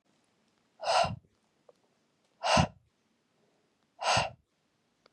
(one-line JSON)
{"exhalation_length": "5.1 s", "exhalation_amplitude": 9571, "exhalation_signal_mean_std_ratio": 0.32, "survey_phase": "beta (2021-08-13 to 2022-03-07)", "age": "18-44", "gender": "Female", "wearing_mask": "No", "symptom_runny_or_blocked_nose": true, "smoker_status": "Never smoked", "respiratory_condition_asthma": false, "respiratory_condition_other": false, "recruitment_source": "REACT", "submission_delay": "1 day", "covid_test_result": "Negative", "covid_test_method": "RT-qPCR", "influenza_a_test_result": "Negative", "influenza_b_test_result": "Negative"}